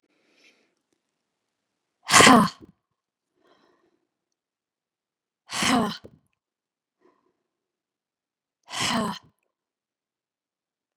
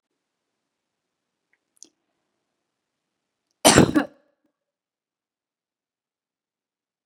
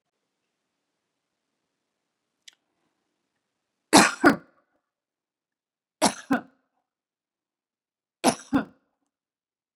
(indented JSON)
{
  "exhalation_length": "11.0 s",
  "exhalation_amplitude": 30418,
  "exhalation_signal_mean_std_ratio": 0.21,
  "cough_length": "7.1 s",
  "cough_amplitude": 32262,
  "cough_signal_mean_std_ratio": 0.15,
  "three_cough_length": "9.8 s",
  "three_cough_amplitude": 28598,
  "three_cough_signal_mean_std_ratio": 0.19,
  "survey_phase": "beta (2021-08-13 to 2022-03-07)",
  "age": "45-64",
  "gender": "Female",
  "wearing_mask": "No",
  "symptom_none": true,
  "smoker_status": "Never smoked",
  "respiratory_condition_asthma": false,
  "respiratory_condition_other": false,
  "recruitment_source": "REACT",
  "submission_delay": "3 days",
  "covid_test_result": "Negative",
  "covid_test_method": "RT-qPCR",
  "influenza_a_test_result": "Negative",
  "influenza_b_test_result": "Negative"
}